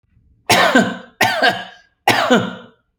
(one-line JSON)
{"three_cough_length": "3.0 s", "three_cough_amplitude": 32768, "three_cough_signal_mean_std_ratio": 0.55, "survey_phase": "beta (2021-08-13 to 2022-03-07)", "age": "45-64", "gender": "Male", "wearing_mask": "No", "symptom_none": true, "smoker_status": "Never smoked", "respiratory_condition_asthma": false, "respiratory_condition_other": false, "recruitment_source": "REACT", "submission_delay": "1 day", "covid_test_result": "Negative", "covid_test_method": "RT-qPCR"}